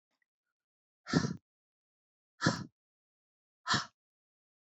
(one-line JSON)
{"exhalation_length": "4.6 s", "exhalation_amplitude": 6425, "exhalation_signal_mean_std_ratio": 0.26, "survey_phase": "alpha (2021-03-01 to 2021-08-12)", "age": "45-64", "gender": "Female", "wearing_mask": "No", "symptom_none": true, "smoker_status": "Never smoked", "respiratory_condition_asthma": false, "respiratory_condition_other": false, "recruitment_source": "REACT", "submission_delay": "1 day", "covid_test_result": "Negative", "covid_test_method": "RT-qPCR"}